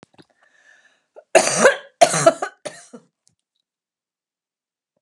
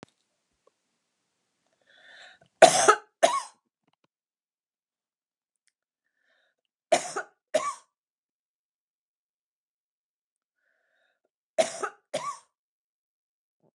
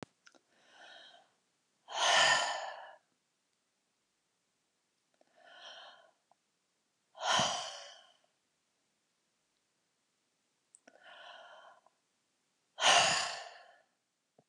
{
  "cough_length": "5.0 s",
  "cough_amplitude": 32768,
  "cough_signal_mean_std_ratio": 0.27,
  "three_cough_length": "13.7 s",
  "three_cough_amplitude": 31069,
  "three_cough_signal_mean_std_ratio": 0.18,
  "exhalation_length": "14.5 s",
  "exhalation_amplitude": 7070,
  "exhalation_signal_mean_std_ratio": 0.29,
  "survey_phase": "beta (2021-08-13 to 2022-03-07)",
  "age": "65+",
  "gender": "Female",
  "wearing_mask": "No",
  "symptom_cough_any": true,
  "smoker_status": "Never smoked",
  "respiratory_condition_asthma": false,
  "respiratory_condition_other": false,
  "recruitment_source": "REACT",
  "submission_delay": "1 day",
  "covid_test_result": "Negative",
  "covid_test_method": "RT-qPCR"
}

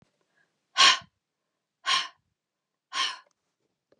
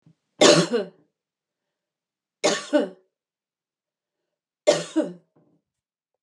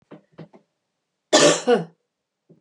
{
  "exhalation_length": "4.0 s",
  "exhalation_amplitude": 16210,
  "exhalation_signal_mean_std_ratio": 0.27,
  "three_cough_length": "6.2 s",
  "three_cough_amplitude": 29061,
  "three_cough_signal_mean_std_ratio": 0.29,
  "cough_length": "2.6 s",
  "cough_amplitude": 30607,
  "cough_signal_mean_std_ratio": 0.32,
  "survey_phase": "beta (2021-08-13 to 2022-03-07)",
  "age": "45-64",
  "gender": "Female",
  "wearing_mask": "No",
  "symptom_cough_any": true,
  "symptom_runny_or_blocked_nose": true,
  "symptom_sore_throat": true,
  "symptom_fatigue": true,
  "symptom_headache": true,
  "symptom_change_to_sense_of_smell_or_taste": true,
  "smoker_status": "Never smoked",
  "respiratory_condition_asthma": false,
  "respiratory_condition_other": false,
  "recruitment_source": "Test and Trace",
  "submission_delay": "1 day",
  "covid_test_result": "Positive",
  "covid_test_method": "LFT"
}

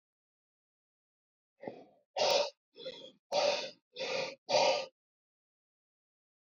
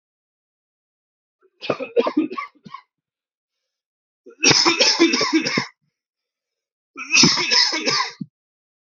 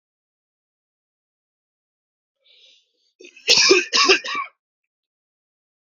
{
  "exhalation_length": "6.5 s",
  "exhalation_amplitude": 4974,
  "exhalation_signal_mean_std_ratio": 0.38,
  "three_cough_length": "8.9 s",
  "three_cough_amplitude": 32102,
  "three_cough_signal_mean_std_ratio": 0.43,
  "cough_length": "5.9 s",
  "cough_amplitude": 28383,
  "cough_signal_mean_std_ratio": 0.28,
  "survey_phase": "beta (2021-08-13 to 2022-03-07)",
  "age": "18-44",
  "gender": "Male",
  "wearing_mask": "No",
  "symptom_none": true,
  "smoker_status": "Ex-smoker",
  "respiratory_condition_asthma": true,
  "respiratory_condition_other": false,
  "recruitment_source": "REACT",
  "submission_delay": "2 days",
  "covid_test_result": "Negative",
  "covid_test_method": "RT-qPCR",
  "influenza_a_test_result": "Negative",
  "influenza_b_test_result": "Negative"
}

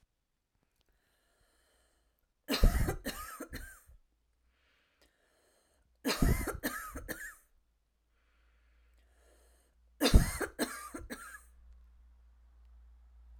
{
  "three_cough_length": "13.4 s",
  "three_cough_amplitude": 11144,
  "three_cough_signal_mean_std_ratio": 0.28,
  "survey_phase": "alpha (2021-03-01 to 2021-08-12)",
  "age": "18-44",
  "gender": "Female",
  "wearing_mask": "No",
  "symptom_none": true,
  "smoker_status": "Never smoked",
  "respiratory_condition_asthma": false,
  "respiratory_condition_other": false,
  "recruitment_source": "REACT",
  "submission_delay": "1 day",
  "covid_test_result": "Negative",
  "covid_test_method": "RT-qPCR"
}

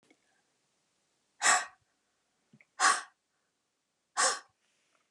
{
  "exhalation_length": "5.1 s",
  "exhalation_amplitude": 9129,
  "exhalation_signal_mean_std_ratio": 0.27,
  "survey_phase": "beta (2021-08-13 to 2022-03-07)",
  "age": "45-64",
  "gender": "Female",
  "wearing_mask": "No",
  "symptom_none": true,
  "smoker_status": "Never smoked",
  "respiratory_condition_asthma": false,
  "respiratory_condition_other": false,
  "recruitment_source": "REACT",
  "submission_delay": "3 days",
  "covid_test_result": "Negative",
  "covid_test_method": "RT-qPCR",
  "influenza_a_test_result": "Unknown/Void",
  "influenza_b_test_result": "Unknown/Void"
}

